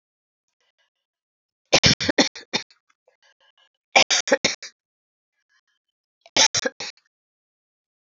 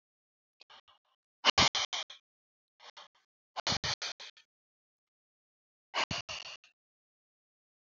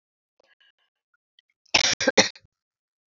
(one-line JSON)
{"three_cough_length": "8.2 s", "three_cough_amplitude": 29688, "three_cough_signal_mean_std_ratio": 0.26, "exhalation_length": "7.9 s", "exhalation_amplitude": 8880, "exhalation_signal_mean_std_ratio": 0.26, "cough_length": "3.2 s", "cough_amplitude": 26570, "cough_signal_mean_std_ratio": 0.24, "survey_phase": "beta (2021-08-13 to 2022-03-07)", "age": "45-64", "gender": "Female", "wearing_mask": "No", "symptom_none": true, "smoker_status": "Never smoked", "respiratory_condition_asthma": true, "respiratory_condition_other": false, "recruitment_source": "REACT", "submission_delay": "1 day", "covid_test_result": "Negative", "covid_test_method": "RT-qPCR", "influenza_a_test_result": "Negative", "influenza_b_test_result": "Negative"}